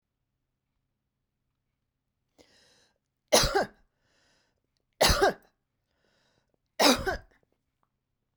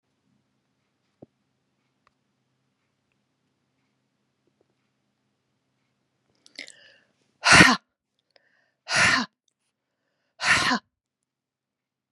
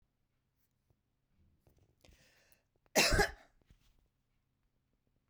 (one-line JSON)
{"three_cough_length": "8.4 s", "three_cough_amplitude": 19275, "three_cough_signal_mean_std_ratio": 0.25, "exhalation_length": "12.1 s", "exhalation_amplitude": 32257, "exhalation_signal_mean_std_ratio": 0.21, "cough_length": "5.3 s", "cough_amplitude": 5731, "cough_signal_mean_std_ratio": 0.21, "survey_phase": "beta (2021-08-13 to 2022-03-07)", "age": "65+", "gender": "Female", "wearing_mask": "No", "symptom_none": true, "smoker_status": "Never smoked", "respiratory_condition_asthma": false, "respiratory_condition_other": false, "recruitment_source": "REACT", "submission_delay": "1 day", "covid_test_result": "Negative", "covid_test_method": "RT-qPCR"}